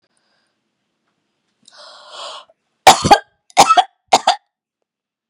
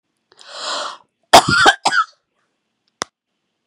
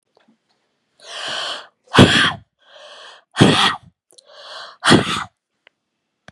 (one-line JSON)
{"three_cough_length": "5.3 s", "three_cough_amplitude": 32768, "three_cough_signal_mean_std_ratio": 0.26, "cough_length": "3.7 s", "cough_amplitude": 32768, "cough_signal_mean_std_ratio": 0.33, "exhalation_length": "6.3 s", "exhalation_amplitude": 32768, "exhalation_signal_mean_std_ratio": 0.35, "survey_phase": "beta (2021-08-13 to 2022-03-07)", "age": "65+", "gender": "Female", "wearing_mask": "No", "symptom_cough_any": true, "symptom_runny_or_blocked_nose": true, "symptom_headache": true, "symptom_onset": "3 days", "smoker_status": "Ex-smoker", "respiratory_condition_asthma": false, "respiratory_condition_other": true, "recruitment_source": "Test and Trace", "submission_delay": "1 day", "covid_test_result": "Positive", "covid_test_method": "RT-qPCR", "covid_ct_value": 23.9, "covid_ct_gene": "N gene"}